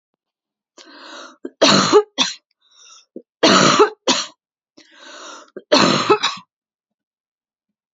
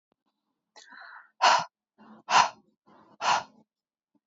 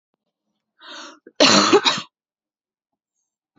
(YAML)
three_cough_length: 7.9 s
three_cough_amplitude: 31717
three_cough_signal_mean_std_ratio: 0.38
exhalation_length: 4.3 s
exhalation_amplitude: 14347
exhalation_signal_mean_std_ratio: 0.3
cough_length: 3.6 s
cough_amplitude: 32440
cough_signal_mean_std_ratio: 0.31
survey_phase: beta (2021-08-13 to 2022-03-07)
age: 18-44
gender: Female
wearing_mask: 'No'
symptom_cough_any: true
symptom_onset: 4 days
smoker_status: Never smoked
respiratory_condition_asthma: false
respiratory_condition_other: false
recruitment_source: Test and Trace
submission_delay: 3 days
covid_test_result: Positive
covid_test_method: RT-qPCR
covid_ct_value: 30.6
covid_ct_gene: N gene
covid_ct_mean: 30.6
covid_viral_load: 89 copies/ml
covid_viral_load_category: Minimal viral load (< 10K copies/ml)